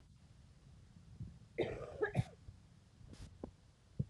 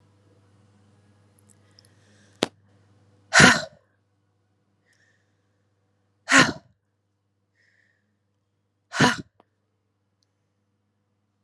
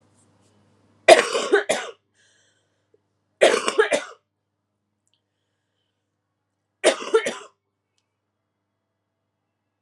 {"cough_length": "4.1 s", "cough_amplitude": 2219, "cough_signal_mean_std_ratio": 0.42, "exhalation_length": "11.4 s", "exhalation_amplitude": 32767, "exhalation_signal_mean_std_ratio": 0.19, "three_cough_length": "9.8 s", "three_cough_amplitude": 32768, "three_cough_signal_mean_std_ratio": 0.25, "survey_phase": "alpha (2021-03-01 to 2021-08-12)", "age": "18-44", "gender": "Female", "wearing_mask": "No", "symptom_cough_any": true, "symptom_fatigue": true, "symptom_headache": true, "symptom_onset": "4 days", "smoker_status": "Prefer not to say", "respiratory_condition_asthma": false, "respiratory_condition_other": false, "recruitment_source": "Test and Trace", "submission_delay": "2 days", "covid_test_result": "Positive", "covid_test_method": "RT-qPCR"}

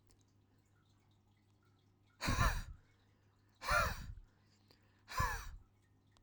{"exhalation_length": "6.2 s", "exhalation_amplitude": 3536, "exhalation_signal_mean_std_ratio": 0.37, "survey_phase": "alpha (2021-03-01 to 2021-08-12)", "age": "18-44", "gender": "Male", "wearing_mask": "No", "symptom_none": true, "smoker_status": "Never smoked", "respiratory_condition_asthma": false, "respiratory_condition_other": false, "recruitment_source": "REACT", "submission_delay": "1 day", "covid_test_result": "Negative", "covid_test_method": "RT-qPCR"}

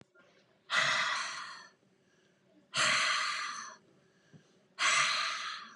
{"exhalation_length": "5.8 s", "exhalation_amplitude": 5763, "exhalation_signal_mean_std_ratio": 0.56, "survey_phase": "beta (2021-08-13 to 2022-03-07)", "age": "45-64", "gender": "Female", "wearing_mask": "No", "symptom_none": true, "symptom_onset": "13 days", "smoker_status": "Ex-smoker", "respiratory_condition_asthma": false, "respiratory_condition_other": false, "recruitment_source": "REACT", "submission_delay": "4 days", "covid_test_result": "Negative", "covid_test_method": "RT-qPCR", "influenza_a_test_result": "Negative", "influenza_b_test_result": "Negative"}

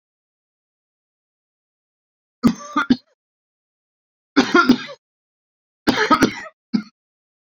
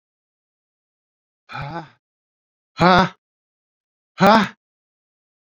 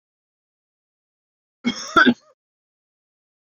{"three_cough_length": "7.4 s", "three_cough_amplitude": 28122, "three_cough_signal_mean_std_ratio": 0.29, "exhalation_length": "5.5 s", "exhalation_amplitude": 31806, "exhalation_signal_mean_std_ratio": 0.25, "cough_length": "3.5 s", "cough_amplitude": 26765, "cough_signal_mean_std_ratio": 0.22, "survey_phase": "beta (2021-08-13 to 2022-03-07)", "age": "45-64", "gender": "Male", "wearing_mask": "No", "symptom_runny_or_blocked_nose": true, "symptom_sore_throat": true, "symptom_fatigue": true, "symptom_headache": true, "symptom_change_to_sense_of_smell_or_taste": true, "symptom_loss_of_taste": true, "symptom_onset": "3 days", "smoker_status": "Never smoked", "respiratory_condition_asthma": false, "respiratory_condition_other": false, "recruitment_source": "Test and Trace", "submission_delay": "2 days", "covid_test_result": "Positive", "covid_test_method": "RT-qPCR", "covid_ct_value": 16.1, "covid_ct_gene": "ORF1ab gene", "covid_ct_mean": 17.2, "covid_viral_load": "2400000 copies/ml", "covid_viral_load_category": "High viral load (>1M copies/ml)"}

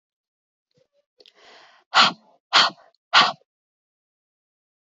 {"exhalation_length": "4.9 s", "exhalation_amplitude": 25576, "exhalation_signal_mean_std_ratio": 0.25, "survey_phase": "beta (2021-08-13 to 2022-03-07)", "age": "18-44", "gender": "Female", "wearing_mask": "No", "symptom_none": true, "smoker_status": "Never smoked", "respiratory_condition_asthma": false, "respiratory_condition_other": false, "recruitment_source": "REACT", "submission_delay": "2 days", "covid_test_result": "Negative", "covid_test_method": "RT-qPCR"}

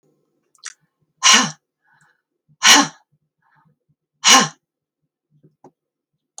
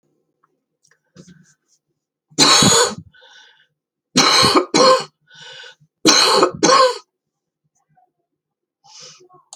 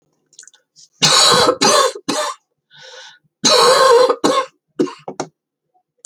{"exhalation_length": "6.4 s", "exhalation_amplitude": 32768, "exhalation_signal_mean_std_ratio": 0.26, "three_cough_length": "9.6 s", "three_cough_amplitude": 32768, "three_cough_signal_mean_std_ratio": 0.4, "cough_length": "6.1 s", "cough_amplitude": 32768, "cough_signal_mean_std_ratio": 0.52, "survey_phase": "beta (2021-08-13 to 2022-03-07)", "age": "45-64", "gender": "Female", "wearing_mask": "No", "symptom_new_continuous_cough": true, "symptom_runny_or_blocked_nose": true, "symptom_sore_throat": true, "symptom_change_to_sense_of_smell_or_taste": true, "symptom_onset": "4 days", "smoker_status": "Never smoked", "respiratory_condition_asthma": false, "respiratory_condition_other": false, "recruitment_source": "Test and Trace", "submission_delay": "2 days", "covid_test_result": "Positive", "covid_test_method": "LAMP"}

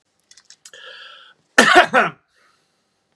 {"cough_length": "3.2 s", "cough_amplitude": 32768, "cough_signal_mean_std_ratio": 0.29, "survey_phase": "beta (2021-08-13 to 2022-03-07)", "age": "18-44", "gender": "Male", "wearing_mask": "No", "symptom_shortness_of_breath": true, "symptom_fatigue": true, "smoker_status": "Ex-smoker", "respiratory_condition_asthma": false, "respiratory_condition_other": false, "recruitment_source": "REACT", "submission_delay": "1 day", "covid_test_result": "Negative", "covid_test_method": "RT-qPCR", "influenza_a_test_result": "Negative", "influenza_b_test_result": "Negative"}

